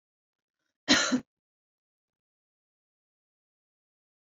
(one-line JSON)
{"cough_length": "4.3 s", "cough_amplitude": 11255, "cough_signal_mean_std_ratio": 0.2, "survey_phase": "beta (2021-08-13 to 2022-03-07)", "age": "18-44", "gender": "Female", "wearing_mask": "No", "symptom_runny_or_blocked_nose": true, "symptom_sore_throat": true, "symptom_fatigue": true, "symptom_onset": "9 days", "smoker_status": "Ex-smoker", "respiratory_condition_asthma": false, "respiratory_condition_other": false, "recruitment_source": "REACT", "submission_delay": "2 days", "covid_test_result": "Negative", "covid_test_method": "RT-qPCR", "influenza_a_test_result": "Negative", "influenza_b_test_result": "Negative"}